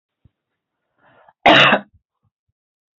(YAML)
cough_length: 3.0 s
cough_amplitude: 29191
cough_signal_mean_std_ratio: 0.27
survey_phase: beta (2021-08-13 to 2022-03-07)
age: 45-64
gender: Female
wearing_mask: 'No'
symptom_none: true
smoker_status: Never smoked
respiratory_condition_asthma: false
respiratory_condition_other: false
recruitment_source: REACT
submission_delay: 2 days
covid_test_result: Negative
covid_test_method: RT-qPCR
influenza_a_test_result: Negative
influenza_b_test_result: Negative